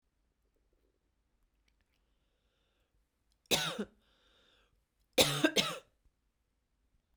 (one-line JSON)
{"three_cough_length": "7.2 s", "three_cough_amplitude": 10362, "three_cough_signal_mean_std_ratio": 0.24, "survey_phase": "beta (2021-08-13 to 2022-03-07)", "age": "18-44", "gender": "Female", "wearing_mask": "No", "symptom_runny_or_blocked_nose": true, "symptom_fatigue": true, "symptom_headache": true, "symptom_other": true, "symptom_onset": "2 days", "smoker_status": "Never smoked", "respiratory_condition_asthma": false, "respiratory_condition_other": false, "recruitment_source": "Test and Trace", "submission_delay": "2 days", "covid_test_result": "Positive", "covid_test_method": "RT-qPCR", "covid_ct_value": 31.5, "covid_ct_gene": "N gene"}